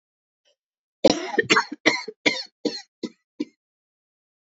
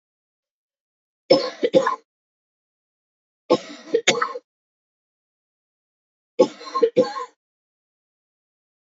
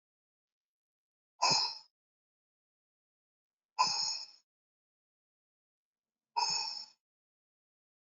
{
  "cough_length": "4.5 s",
  "cough_amplitude": 26672,
  "cough_signal_mean_std_ratio": 0.31,
  "three_cough_length": "8.9 s",
  "three_cough_amplitude": 30328,
  "three_cough_signal_mean_std_ratio": 0.28,
  "exhalation_length": "8.2 s",
  "exhalation_amplitude": 5308,
  "exhalation_signal_mean_std_ratio": 0.29,
  "survey_phase": "beta (2021-08-13 to 2022-03-07)",
  "age": "45-64",
  "gender": "Female",
  "wearing_mask": "No",
  "symptom_cough_any": true,
  "symptom_new_continuous_cough": true,
  "symptom_runny_or_blocked_nose": true,
  "symptom_shortness_of_breath": true,
  "symptom_sore_throat": true,
  "symptom_fatigue": true,
  "symptom_fever_high_temperature": true,
  "symptom_change_to_sense_of_smell_or_taste": true,
  "symptom_loss_of_taste": true,
  "symptom_onset": "4 days",
  "smoker_status": "Never smoked",
  "respiratory_condition_asthma": false,
  "respiratory_condition_other": false,
  "recruitment_source": "Test and Trace",
  "submission_delay": "2 days",
  "covid_test_method": "PCR",
  "covid_ct_value": 34.3,
  "covid_ct_gene": "ORF1ab gene"
}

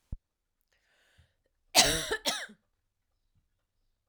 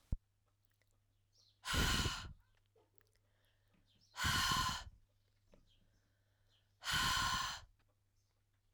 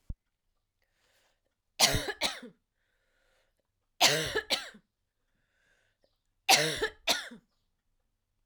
{
  "cough_length": "4.1 s",
  "cough_amplitude": 16711,
  "cough_signal_mean_std_ratio": 0.26,
  "exhalation_length": "8.7 s",
  "exhalation_amplitude": 2316,
  "exhalation_signal_mean_std_ratio": 0.41,
  "three_cough_length": "8.5 s",
  "three_cough_amplitude": 14014,
  "three_cough_signal_mean_std_ratio": 0.3,
  "survey_phase": "alpha (2021-03-01 to 2021-08-12)",
  "age": "45-64",
  "gender": "Female",
  "wearing_mask": "No",
  "symptom_cough_any": true,
  "symptom_new_continuous_cough": true,
  "symptom_fatigue": true,
  "symptom_change_to_sense_of_smell_or_taste": true,
  "symptom_loss_of_taste": true,
  "symptom_onset": "4 days",
  "smoker_status": "Never smoked",
  "respiratory_condition_asthma": false,
  "respiratory_condition_other": false,
  "recruitment_source": "Test and Trace",
  "submission_delay": "1 day",
  "covid_test_result": "Positive",
  "covid_test_method": "RT-qPCR",
  "covid_ct_value": 12.3,
  "covid_ct_gene": "ORF1ab gene",
  "covid_ct_mean": 12.8,
  "covid_viral_load": "65000000 copies/ml",
  "covid_viral_load_category": "High viral load (>1M copies/ml)"
}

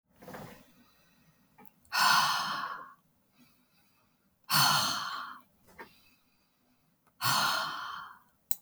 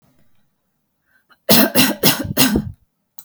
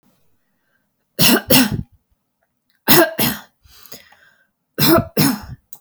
{
  "exhalation_length": "8.6 s",
  "exhalation_amplitude": 32379,
  "exhalation_signal_mean_std_ratio": 0.42,
  "cough_length": "3.2 s",
  "cough_amplitude": 32768,
  "cough_signal_mean_std_ratio": 0.42,
  "three_cough_length": "5.8 s",
  "three_cough_amplitude": 32768,
  "three_cough_signal_mean_std_ratio": 0.39,
  "survey_phase": "alpha (2021-03-01 to 2021-08-12)",
  "age": "18-44",
  "gender": "Female",
  "wearing_mask": "No",
  "symptom_fatigue": true,
  "smoker_status": "Never smoked",
  "respiratory_condition_asthma": false,
  "respiratory_condition_other": false,
  "recruitment_source": "Test and Trace",
  "submission_delay": "2 days",
  "covid_test_result": "Positive",
  "covid_test_method": "RT-qPCR",
  "covid_ct_value": 17.0,
  "covid_ct_gene": "ORF1ab gene",
  "covid_ct_mean": 17.4,
  "covid_viral_load": "2000000 copies/ml",
  "covid_viral_load_category": "High viral load (>1M copies/ml)"
}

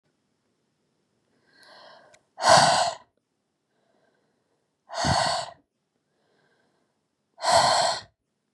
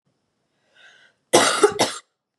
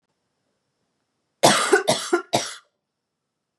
{
  "exhalation_length": "8.5 s",
  "exhalation_amplitude": 24762,
  "exhalation_signal_mean_std_ratio": 0.33,
  "cough_length": "2.4 s",
  "cough_amplitude": 32384,
  "cough_signal_mean_std_ratio": 0.35,
  "three_cough_length": "3.6 s",
  "three_cough_amplitude": 29309,
  "three_cough_signal_mean_std_ratio": 0.34,
  "survey_phase": "beta (2021-08-13 to 2022-03-07)",
  "age": "18-44",
  "gender": "Female",
  "wearing_mask": "No",
  "symptom_cough_any": true,
  "symptom_new_continuous_cough": true,
  "symptom_runny_or_blocked_nose": true,
  "symptom_fatigue": true,
  "symptom_change_to_sense_of_smell_or_taste": true,
  "symptom_onset": "5 days",
  "smoker_status": "Current smoker (1 to 10 cigarettes per day)",
  "respiratory_condition_asthma": false,
  "respiratory_condition_other": false,
  "recruitment_source": "REACT",
  "submission_delay": "4 days",
  "covid_test_result": "Positive",
  "covid_test_method": "RT-qPCR",
  "covid_ct_value": 19.8,
  "covid_ct_gene": "E gene",
  "influenza_a_test_result": "Negative",
  "influenza_b_test_result": "Negative"
}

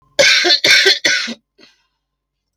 {
  "cough_length": "2.6 s",
  "cough_amplitude": 32768,
  "cough_signal_mean_std_ratio": 0.53,
  "survey_phase": "beta (2021-08-13 to 2022-03-07)",
  "age": "65+",
  "gender": "Female",
  "wearing_mask": "No",
  "symptom_cough_any": true,
  "symptom_runny_or_blocked_nose": true,
  "symptom_other": true,
  "smoker_status": "Never smoked",
  "respiratory_condition_asthma": true,
  "respiratory_condition_other": false,
  "recruitment_source": "Test and Trace",
  "submission_delay": "1 day",
  "covid_test_result": "Negative",
  "covid_test_method": "RT-qPCR"
}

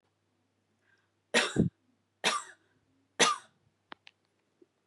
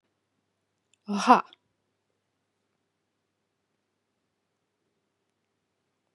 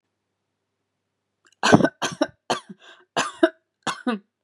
{
  "three_cough_length": "4.9 s",
  "three_cough_amplitude": 10887,
  "three_cough_signal_mean_std_ratio": 0.28,
  "exhalation_length": "6.1 s",
  "exhalation_amplitude": 23656,
  "exhalation_signal_mean_std_ratio": 0.14,
  "cough_length": "4.4 s",
  "cough_amplitude": 32767,
  "cough_signal_mean_std_ratio": 0.3,
  "survey_phase": "beta (2021-08-13 to 2022-03-07)",
  "age": "45-64",
  "gender": "Female",
  "wearing_mask": "No",
  "symptom_none": true,
  "smoker_status": "Never smoked",
  "respiratory_condition_asthma": false,
  "respiratory_condition_other": false,
  "recruitment_source": "REACT",
  "submission_delay": "2 days",
  "covid_test_result": "Negative",
  "covid_test_method": "RT-qPCR",
  "influenza_a_test_result": "Negative",
  "influenza_b_test_result": "Negative"
}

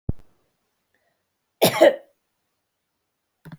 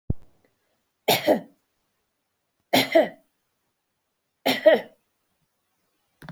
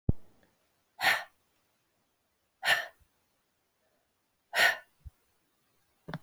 {
  "cough_length": "3.6 s",
  "cough_amplitude": 25557,
  "cough_signal_mean_std_ratio": 0.23,
  "three_cough_length": "6.3 s",
  "three_cough_amplitude": 21857,
  "three_cough_signal_mean_std_ratio": 0.29,
  "exhalation_length": "6.2 s",
  "exhalation_amplitude": 9197,
  "exhalation_signal_mean_std_ratio": 0.28,
  "survey_phase": "beta (2021-08-13 to 2022-03-07)",
  "age": "65+",
  "gender": "Female",
  "wearing_mask": "No",
  "symptom_fatigue": true,
  "smoker_status": "Ex-smoker",
  "respiratory_condition_asthma": false,
  "respiratory_condition_other": false,
  "recruitment_source": "REACT",
  "submission_delay": "14 days",
  "covid_test_result": "Negative",
  "covid_test_method": "RT-qPCR",
  "influenza_a_test_result": "Unknown/Void",
  "influenza_b_test_result": "Unknown/Void"
}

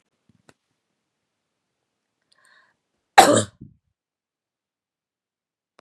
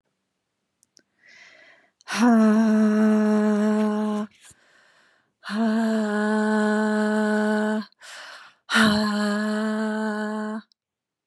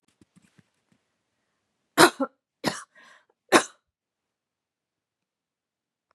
{
  "cough_length": "5.8 s",
  "cough_amplitude": 32768,
  "cough_signal_mean_std_ratio": 0.15,
  "exhalation_length": "11.3 s",
  "exhalation_amplitude": 16102,
  "exhalation_signal_mean_std_ratio": 0.73,
  "three_cough_length": "6.1 s",
  "three_cough_amplitude": 30708,
  "three_cough_signal_mean_std_ratio": 0.17,
  "survey_phase": "beta (2021-08-13 to 2022-03-07)",
  "age": "18-44",
  "gender": "Female",
  "wearing_mask": "No",
  "symptom_runny_or_blocked_nose": true,
  "symptom_sore_throat": true,
  "symptom_fatigue": true,
  "symptom_onset": "12 days",
  "smoker_status": "Ex-smoker",
  "respiratory_condition_asthma": false,
  "respiratory_condition_other": false,
  "recruitment_source": "REACT",
  "submission_delay": "3 days",
  "covid_test_result": "Negative",
  "covid_test_method": "RT-qPCR",
  "influenza_a_test_result": "Negative",
  "influenza_b_test_result": "Negative"
}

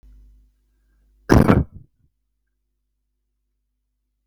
{
  "cough_length": "4.3 s",
  "cough_amplitude": 32768,
  "cough_signal_mean_std_ratio": 0.21,
  "survey_phase": "beta (2021-08-13 to 2022-03-07)",
  "age": "65+",
  "gender": "Male",
  "wearing_mask": "No",
  "symptom_none": true,
  "smoker_status": "Never smoked",
  "respiratory_condition_asthma": false,
  "respiratory_condition_other": false,
  "recruitment_source": "REACT",
  "submission_delay": "1 day",
  "covid_test_result": "Negative",
  "covid_test_method": "RT-qPCR",
  "influenza_a_test_result": "Negative",
  "influenza_b_test_result": "Negative"
}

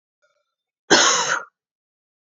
{
  "cough_length": "2.4 s",
  "cough_amplitude": 30814,
  "cough_signal_mean_std_ratio": 0.35,
  "survey_phase": "beta (2021-08-13 to 2022-03-07)",
  "age": "18-44",
  "gender": "Female",
  "wearing_mask": "No",
  "symptom_cough_any": true,
  "symptom_runny_or_blocked_nose": true,
  "symptom_shortness_of_breath": true,
  "symptom_sore_throat": true,
  "symptom_fatigue": true,
  "symptom_onset": "5 days",
  "smoker_status": "Never smoked",
  "respiratory_condition_asthma": false,
  "respiratory_condition_other": false,
  "recruitment_source": "Test and Trace",
  "submission_delay": "2 days",
  "covid_test_result": "Positive",
  "covid_test_method": "RT-qPCR",
  "covid_ct_value": 22.0,
  "covid_ct_gene": "N gene"
}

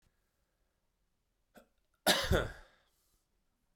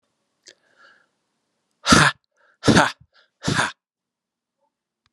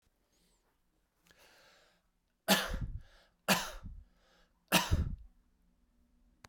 {
  "cough_length": "3.8 s",
  "cough_amplitude": 6411,
  "cough_signal_mean_std_ratio": 0.26,
  "exhalation_length": "5.1 s",
  "exhalation_amplitude": 32767,
  "exhalation_signal_mean_std_ratio": 0.27,
  "three_cough_length": "6.5 s",
  "three_cough_amplitude": 7382,
  "three_cough_signal_mean_std_ratio": 0.31,
  "survey_phase": "beta (2021-08-13 to 2022-03-07)",
  "age": "18-44",
  "gender": "Male",
  "wearing_mask": "No",
  "symptom_cough_any": true,
  "symptom_shortness_of_breath": true,
  "symptom_fatigue": true,
  "symptom_headache": true,
  "smoker_status": "Never smoked",
  "respiratory_condition_asthma": false,
  "respiratory_condition_other": false,
  "recruitment_source": "Test and Trace",
  "submission_delay": "2 days",
  "covid_test_result": "Positive",
  "covid_test_method": "RT-qPCR"
}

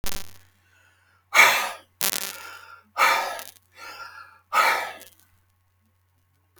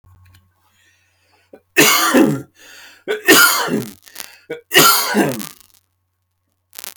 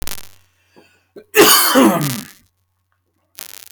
{
  "exhalation_length": "6.6 s",
  "exhalation_amplitude": 32767,
  "exhalation_signal_mean_std_ratio": 0.37,
  "three_cough_length": "7.0 s",
  "three_cough_amplitude": 32768,
  "three_cough_signal_mean_std_ratio": 0.43,
  "cough_length": "3.7 s",
  "cough_amplitude": 32768,
  "cough_signal_mean_std_ratio": 0.41,
  "survey_phase": "beta (2021-08-13 to 2022-03-07)",
  "age": "45-64",
  "gender": "Male",
  "wearing_mask": "No",
  "symptom_none": true,
  "smoker_status": "Ex-smoker",
  "respiratory_condition_asthma": false,
  "respiratory_condition_other": false,
  "recruitment_source": "REACT",
  "submission_delay": "3 days",
  "covid_test_result": "Negative",
  "covid_test_method": "RT-qPCR"
}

